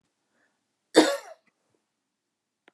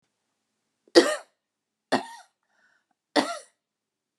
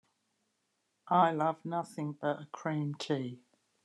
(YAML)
cough_length: 2.7 s
cough_amplitude: 25385
cough_signal_mean_std_ratio: 0.19
three_cough_length: 4.2 s
three_cough_amplitude: 28149
three_cough_signal_mean_std_ratio: 0.22
exhalation_length: 3.8 s
exhalation_amplitude: 7498
exhalation_signal_mean_std_ratio: 0.47
survey_phase: beta (2021-08-13 to 2022-03-07)
age: 45-64
gender: Female
wearing_mask: 'No'
symptom_none: true
smoker_status: Ex-smoker
respiratory_condition_asthma: false
respiratory_condition_other: false
recruitment_source: REACT
submission_delay: 1 day
covid_test_result: Negative
covid_test_method: RT-qPCR
influenza_a_test_result: Unknown/Void
influenza_b_test_result: Unknown/Void